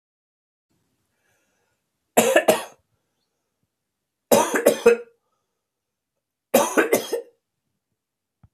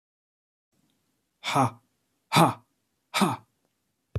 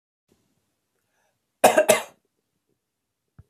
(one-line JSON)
{"three_cough_length": "8.5 s", "three_cough_amplitude": 27306, "three_cough_signal_mean_std_ratio": 0.3, "exhalation_length": "4.2 s", "exhalation_amplitude": 19094, "exhalation_signal_mean_std_ratio": 0.3, "cough_length": "3.5 s", "cough_amplitude": 28084, "cough_signal_mean_std_ratio": 0.22, "survey_phase": "beta (2021-08-13 to 2022-03-07)", "age": "45-64", "gender": "Male", "wearing_mask": "No", "symptom_cough_any": true, "symptom_runny_or_blocked_nose": true, "symptom_sore_throat": true, "symptom_fatigue": true, "symptom_onset": "9 days", "smoker_status": "Never smoked", "respiratory_condition_asthma": false, "respiratory_condition_other": false, "recruitment_source": "Test and Trace", "submission_delay": "2 days", "covid_test_result": "Positive", "covid_test_method": "RT-qPCR", "covid_ct_value": 29.0, "covid_ct_gene": "N gene"}